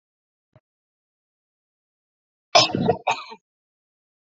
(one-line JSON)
{"cough_length": "4.4 s", "cough_amplitude": 28332, "cough_signal_mean_std_ratio": 0.24, "survey_phase": "beta (2021-08-13 to 2022-03-07)", "age": "18-44", "gender": "Female", "wearing_mask": "No", "symptom_cough_any": true, "symptom_runny_or_blocked_nose": true, "symptom_shortness_of_breath": true, "symptom_sore_throat": true, "symptom_fatigue": true, "symptom_fever_high_temperature": true, "symptom_headache": true, "symptom_onset": "3 days", "smoker_status": "Ex-smoker", "respiratory_condition_asthma": true, "respiratory_condition_other": false, "recruitment_source": "Test and Trace", "submission_delay": "2 days", "covid_test_result": "Positive", "covid_test_method": "RT-qPCR", "covid_ct_value": 26.0, "covid_ct_gene": "N gene"}